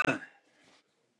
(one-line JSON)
{"cough_length": "1.2 s", "cough_amplitude": 6250, "cough_signal_mean_std_ratio": 0.29, "survey_phase": "beta (2021-08-13 to 2022-03-07)", "age": "45-64", "gender": "Male", "wearing_mask": "No", "symptom_none": true, "smoker_status": "Ex-smoker", "respiratory_condition_asthma": false, "respiratory_condition_other": true, "recruitment_source": "REACT", "submission_delay": "0 days", "covid_test_result": "Negative", "covid_test_method": "RT-qPCR"}